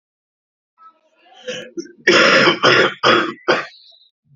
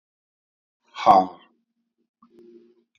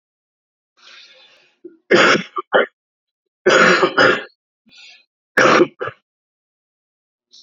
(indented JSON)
{
  "cough_length": "4.4 s",
  "cough_amplitude": 30718,
  "cough_signal_mean_std_ratio": 0.47,
  "exhalation_length": "3.0 s",
  "exhalation_amplitude": 26854,
  "exhalation_signal_mean_std_ratio": 0.22,
  "three_cough_length": "7.4 s",
  "three_cough_amplitude": 29835,
  "three_cough_signal_mean_std_ratio": 0.37,
  "survey_phase": "beta (2021-08-13 to 2022-03-07)",
  "age": "45-64",
  "gender": "Male",
  "wearing_mask": "Yes",
  "symptom_cough_any": true,
  "symptom_runny_or_blocked_nose": true,
  "symptom_sore_throat": true,
  "symptom_fatigue": true,
  "symptom_change_to_sense_of_smell_or_taste": true,
  "symptom_onset": "4 days",
  "smoker_status": "Never smoked",
  "respiratory_condition_asthma": false,
  "respiratory_condition_other": false,
  "recruitment_source": "Test and Trace",
  "submission_delay": "0 days",
  "covid_test_result": "Positive",
  "covid_test_method": "RT-qPCR",
  "covid_ct_value": 17.7,
  "covid_ct_gene": "ORF1ab gene",
  "covid_ct_mean": 18.4,
  "covid_viral_load": "910000 copies/ml",
  "covid_viral_load_category": "Low viral load (10K-1M copies/ml)"
}